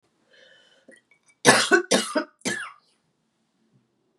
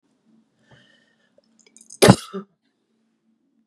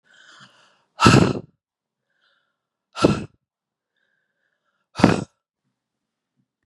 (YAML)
three_cough_length: 4.2 s
three_cough_amplitude: 30672
three_cough_signal_mean_std_ratio: 0.31
cough_length: 3.7 s
cough_amplitude: 32768
cough_signal_mean_std_ratio: 0.16
exhalation_length: 6.7 s
exhalation_amplitude: 32768
exhalation_signal_mean_std_ratio: 0.24
survey_phase: beta (2021-08-13 to 2022-03-07)
age: 45-64
gender: Female
wearing_mask: 'No'
symptom_cough_any: true
symptom_fatigue: true
symptom_fever_high_temperature: true
symptom_headache: true
smoker_status: Never smoked
respiratory_condition_asthma: false
respiratory_condition_other: false
recruitment_source: Test and Trace
submission_delay: 2 days
covid_test_result: Positive
covid_test_method: RT-qPCR
covid_ct_value: 20.7
covid_ct_gene: N gene